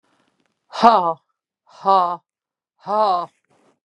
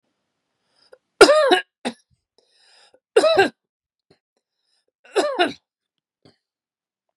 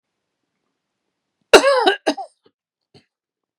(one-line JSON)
{"exhalation_length": "3.8 s", "exhalation_amplitude": 32767, "exhalation_signal_mean_std_ratio": 0.37, "three_cough_length": "7.2 s", "three_cough_amplitude": 32768, "three_cough_signal_mean_std_ratio": 0.29, "cough_length": "3.6 s", "cough_amplitude": 32768, "cough_signal_mean_std_ratio": 0.26, "survey_phase": "beta (2021-08-13 to 2022-03-07)", "age": "45-64", "gender": "Female", "wearing_mask": "No", "symptom_cough_any": true, "symptom_fatigue": true, "symptom_onset": "12 days", "smoker_status": "Never smoked", "respiratory_condition_asthma": false, "respiratory_condition_other": false, "recruitment_source": "REACT", "submission_delay": "2 days", "covid_test_result": "Negative", "covid_test_method": "RT-qPCR", "influenza_a_test_result": "Negative", "influenza_b_test_result": "Negative"}